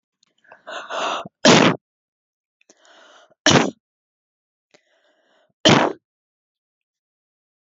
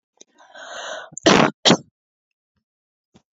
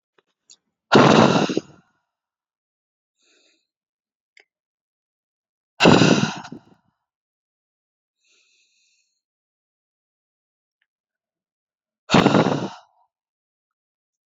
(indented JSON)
{
  "three_cough_length": "7.7 s",
  "three_cough_amplitude": 32629,
  "three_cough_signal_mean_std_ratio": 0.28,
  "cough_length": "3.3 s",
  "cough_amplitude": 29647,
  "cough_signal_mean_std_ratio": 0.29,
  "exhalation_length": "14.3 s",
  "exhalation_amplitude": 28155,
  "exhalation_signal_mean_std_ratio": 0.25,
  "survey_phase": "beta (2021-08-13 to 2022-03-07)",
  "age": "18-44",
  "gender": "Female",
  "wearing_mask": "No",
  "symptom_none": true,
  "smoker_status": "Never smoked",
  "respiratory_condition_asthma": false,
  "respiratory_condition_other": false,
  "recruitment_source": "REACT",
  "submission_delay": "7 days",
  "covid_test_result": "Negative",
  "covid_test_method": "RT-qPCR"
}